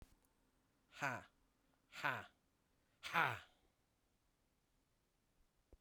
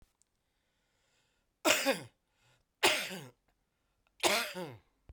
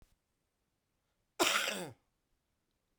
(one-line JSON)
{"exhalation_length": "5.8 s", "exhalation_amplitude": 3088, "exhalation_signal_mean_std_ratio": 0.27, "three_cough_length": "5.1 s", "three_cough_amplitude": 9986, "three_cough_signal_mean_std_ratio": 0.33, "cough_length": "3.0 s", "cough_amplitude": 6976, "cough_signal_mean_std_ratio": 0.29, "survey_phase": "beta (2021-08-13 to 2022-03-07)", "age": "45-64", "gender": "Male", "wearing_mask": "No", "symptom_cough_any": true, "symptom_shortness_of_breath": true, "symptom_diarrhoea": true, "symptom_fatigue": true, "symptom_headache": true, "smoker_status": "Never smoked", "respiratory_condition_asthma": true, "respiratory_condition_other": false, "recruitment_source": "Test and Trace", "submission_delay": "1 day", "covid_test_result": "Positive", "covid_test_method": "RT-qPCR", "covid_ct_value": 15.4, "covid_ct_gene": "ORF1ab gene", "covid_ct_mean": 15.7, "covid_viral_load": "6900000 copies/ml", "covid_viral_load_category": "High viral load (>1M copies/ml)"}